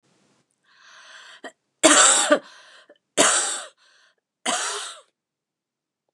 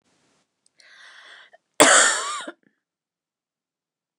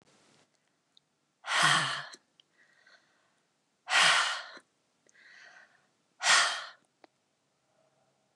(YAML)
three_cough_length: 6.1 s
three_cough_amplitude: 29044
three_cough_signal_mean_std_ratio: 0.35
cough_length: 4.2 s
cough_amplitude: 29204
cough_signal_mean_std_ratio: 0.27
exhalation_length: 8.4 s
exhalation_amplitude: 10094
exhalation_signal_mean_std_ratio: 0.33
survey_phase: beta (2021-08-13 to 2022-03-07)
age: 45-64
gender: Female
wearing_mask: 'No'
symptom_cough_any: true
symptom_runny_or_blocked_nose: true
symptom_onset: 13 days
smoker_status: Ex-smoker
respiratory_condition_asthma: false
respiratory_condition_other: false
recruitment_source: REACT
submission_delay: 1 day
covid_test_result: Negative
covid_test_method: RT-qPCR